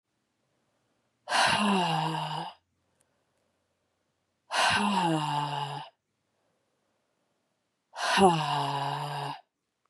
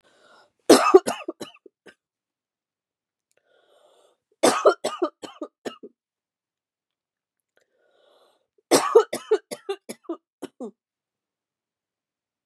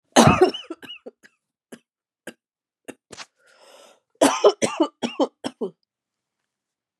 {
  "exhalation_length": "9.9 s",
  "exhalation_amplitude": 13274,
  "exhalation_signal_mean_std_ratio": 0.5,
  "three_cough_length": "12.5 s",
  "three_cough_amplitude": 31917,
  "three_cough_signal_mean_std_ratio": 0.23,
  "cough_length": "7.0 s",
  "cough_amplitude": 31929,
  "cough_signal_mean_std_ratio": 0.29,
  "survey_phase": "beta (2021-08-13 to 2022-03-07)",
  "age": "45-64",
  "gender": "Female",
  "wearing_mask": "No",
  "symptom_cough_any": true,
  "symptom_runny_or_blocked_nose": true,
  "symptom_abdominal_pain": true,
  "symptom_diarrhoea": true,
  "symptom_fatigue": true,
  "symptom_fever_high_temperature": true,
  "symptom_headache": true,
  "symptom_onset": "2 days",
  "smoker_status": "Never smoked",
  "respiratory_condition_asthma": true,
  "respiratory_condition_other": false,
  "recruitment_source": "Test and Trace",
  "submission_delay": "1 day",
  "covid_test_result": "Positive",
  "covid_test_method": "RT-qPCR",
  "covid_ct_value": 25.4,
  "covid_ct_gene": "ORF1ab gene"
}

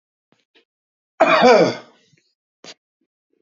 {
  "cough_length": "3.4 s",
  "cough_amplitude": 27730,
  "cough_signal_mean_std_ratio": 0.33,
  "survey_phase": "alpha (2021-03-01 to 2021-08-12)",
  "age": "65+",
  "gender": "Male",
  "wearing_mask": "No",
  "symptom_none": true,
  "smoker_status": "Ex-smoker",
  "respiratory_condition_asthma": false,
  "respiratory_condition_other": false,
  "recruitment_source": "REACT",
  "submission_delay": "2 days",
  "covid_test_result": "Negative",
  "covid_test_method": "RT-qPCR"
}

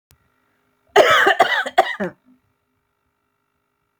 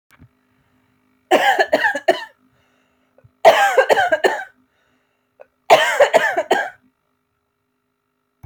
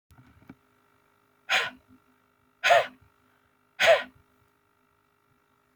{
  "cough_length": "4.0 s",
  "cough_amplitude": 28749,
  "cough_signal_mean_std_ratio": 0.35,
  "three_cough_length": "8.5 s",
  "three_cough_amplitude": 29140,
  "three_cough_signal_mean_std_ratio": 0.4,
  "exhalation_length": "5.8 s",
  "exhalation_amplitude": 14065,
  "exhalation_signal_mean_std_ratio": 0.26,
  "survey_phase": "beta (2021-08-13 to 2022-03-07)",
  "age": "45-64",
  "gender": "Female",
  "wearing_mask": "No",
  "symptom_none": true,
  "symptom_onset": "2 days",
  "smoker_status": "Never smoked",
  "respiratory_condition_asthma": false,
  "respiratory_condition_other": false,
  "recruitment_source": "REACT",
  "submission_delay": "1 day",
  "covid_test_result": "Negative",
  "covid_test_method": "RT-qPCR"
}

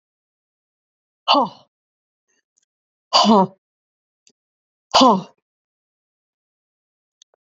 {
  "exhalation_length": "7.4 s",
  "exhalation_amplitude": 27879,
  "exhalation_signal_mean_std_ratio": 0.26,
  "survey_phase": "beta (2021-08-13 to 2022-03-07)",
  "age": "65+",
  "gender": "Female",
  "wearing_mask": "No",
  "symptom_none": true,
  "smoker_status": "Current smoker (1 to 10 cigarettes per day)",
  "respiratory_condition_asthma": false,
  "respiratory_condition_other": false,
  "recruitment_source": "REACT",
  "submission_delay": "2 days",
  "covid_test_result": "Negative",
  "covid_test_method": "RT-qPCR",
  "influenza_a_test_result": "Negative",
  "influenza_b_test_result": "Negative"
}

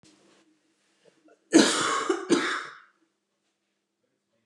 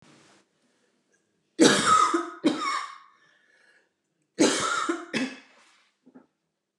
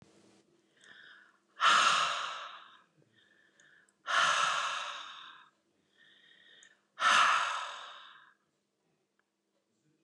{
  "cough_length": "4.5 s",
  "cough_amplitude": 23967,
  "cough_signal_mean_std_ratio": 0.34,
  "three_cough_length": "6.8 s",
  "three_cough_amplitude": 19828,
  "three_cough_signal_mean_std_ratio": 0.4,
  "exhalation_length": "10.0 s",
  "exhalation_amplitude": 7201,
  "exhalation_signal_mean_std_ratio": 0.4,
  "survey_phase": "beta (2021-08-13 to 2022-03-07)",
  "age": "45-64",
  "gender": "Female",
  "wearing_mask": "No",
  "symptom_none": true,
  "smoker_status": "Never smoked",
  "respiratory_condition_asthma": false,
  "respiratory_condition_other": false,
  "recruitment_source": "REACT",
  "submission_delay": "2 days",
  "covid_test_result": "Negative",
  "covid_test_method": "RT-qPCR",
  "influenza_a_test_result": "Negative",
  "influenza_b_test_result": "Negative"
}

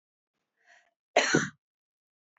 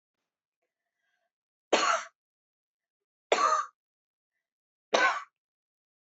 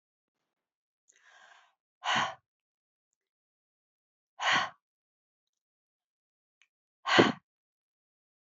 {
  "cough_length": "2.4 s",
  "cough_amplitude": 11545,
  "cough_signal_mean_std_ratio": 0.26,
  "three_cough_length": "6.1 s",
  "three_cough_amplitude": 12162,
  "three_cough_signal_mean_std_ratio": 0.29,
  "exhalation_length": "8.5 s",
  "exhalation_amplitude": 15689,
  "exhalation_signal_mean_std_ratio": 0.22,
  "survey_phase": "beta (2021-08-13 to 2022-03-07)",
  "age": "45-64",
  "gender": "Female",
  "wearing_mask": "No",
  "symptom_none": true,
  "smoker_status": "Never smoked",
  "respiratory_condition_asthma": false,
  "respiratory_condition_other": false,
  "recruitment_source": "REACT",
  "submission_delay": "2 days",
  "covid_test_result": "Negative",
  "covid_test_method": "RT-qPCR",
  "influenza_a_test_result": "Negative",
  "influenza_b_test_result": "Negative"
}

